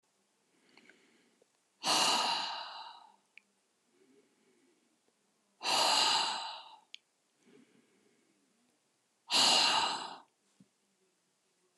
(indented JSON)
{
  "exhalation_length": "11.8 s",
  "exhalation_amplitude": 6515,
  "exhalation_signal_mean_std_ratio": 0.38,
  "survey_phase": "alpha (2021-03-01 to 2021-08-12)",
  "age": "65+",
  "gender": "Female",
  "wearing_mask": "No",
  "symptom_abdominal_pain": true,
  "symptom_change_to_sense_of_smell_or_taste": true,
  "symptom_onset": "13 days",
  "smoker_status": "Never smoked",
  "respiratory_condition_asthma": false,
  "respiratory_condition_other": false,
  "recruitment_source": "REACT",
  "submission_delay": "1 day",
  "covid_test_result": "Negative",
  "covid_test_method": "RT-qPCR"
}